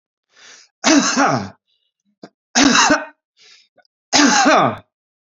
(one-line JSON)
{"three_cough_length": "5.4 s", "three_cough_amplitude": 31796, "three_cough_signal_mean_std_ratio": 0.47, "survey_phase": "alpha (2021-03-01 to 2021-08-12)", "age": "65+", "gender": "Male", "wearing_mask": "No", "symptom_none": true, "smoker_status": "Ex-smoker", "respiratory_condition_asthma": false, "respiratory_condition_other": false, "recruitment_source": "REACT", "submission_delay": "2 days", "covid_test_result": "Negative", "covid_test_method": "RT-qPCR"}